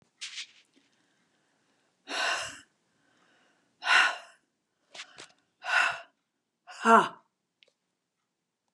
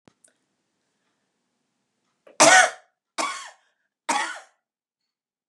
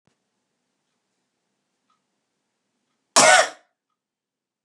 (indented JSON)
{
  "exhalation_length": "8.7 s",
  "exhalation_amplitude": 13899,
  "exhalation_signal_mean_std_ratio": 0.28,
  "three_cough_length": "5.5 s",
  "three_cough_amplitude": 32325,
  "three_cough_signal_mean_std_ratio": 0.24,
  "cough_length": "4.6 s",
  "cough_amplitude": 32761,
  "cough_signal_mean_std_ratio": 0.2,
  "survey_phase": "beta (2021-08-13 to 2022-03-07)",
  "age": "65+",
  "gender": "Female",
  "wearing_mask": "No",
  "symptom_none": true,
  "smoker_status": "Never smoked",
  "respiratory_condition_asthma": false,
  "respiratory_condition_other": false,
  "recruitment_source": "REACT",
  "submission_delay": "2 days",
  "covid_test_result": "Negative",
  "covid_test_method": "RT-qPCR",
  "influenza_a_test_result": "Negative",
  "influenza_b_test_result": "Negative"
}